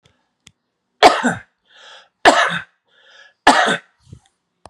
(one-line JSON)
{"three_cough_length": "4.7 s", "three_cough_amplitude": 32768, "three_cough_signal_mean_std_ratio": 0.33, "survey_phase": "beta (2021-08-13 to 2022-03-07)", "age": "45-64", "gender": "Male", "wearing_mask": "No", "symptom_none": true, "smoker_status": "Never smoked", "respiratory_condition_asthma": false, "respiratory_condition_other": false, "recruitment_source": "REACT", "submission_delay": "0 days", "covid_test_result": "Negative", "covid_test_method": "RT-qPCR"}